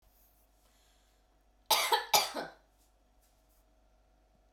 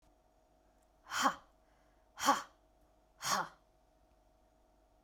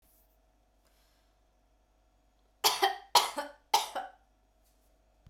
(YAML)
cough_length: 4.5 s
cough_amplitude: 11302
cough_signal_mean_std_ratio: 0.28
exhalation_length: 5.0 s
exhalation_amplitude: 5837
exhalation_signal_mean_std_ratio: 0.29
three_cough_length: 5.3 s
three_cough_amplitude: 11633
three_cough_signal_mean_std_ratio: 0.27
survey_phase: beta (2021-08-13 to 2022-03-07)
age: 18-44
gender: Female
wearing_mask: 'No'
symptom_none: true
smoker_status: Never smoked
respiratory_condition_asthma: false
respiratory_condition_other: false
recruitment_source: REACT
submission_delay: 3 days
covid_test_result: Negative
covid_test_method: RT-qPCR